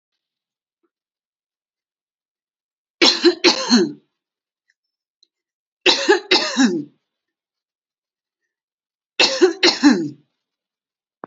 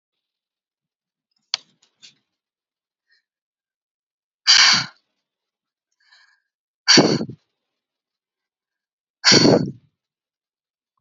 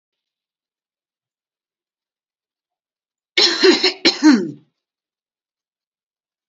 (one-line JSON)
{"three_cough_length": "11.3 s", "three_cough_amplitude": 30933, "three_cough_signal_mean_std_ratio": 0.33, "exhalation_length": "11.0 s", "exhalation_amplitude": 32768, "exhalation_signal_mean_std_ratio": 0.25, "cough_length": "6.5 s", "cough_amplitude": 30568, "cough_signal_mean_std_ratio": 0.28, "survey_phase": "alpha (2021-03-01 to 2021-08-12)", "age": "45-64", "gender": "Female", "wearing_mask": "No", "symptom_none": true, "smoker_status": "Never smoked", "respiratory_condition_asthma": true, "respiratory_condition_other": false, "recruitment_source": "REACT", "submission_delay": "4 days", "covid_test_result": "Negative", "covid_test_method": "RT-qPCR"}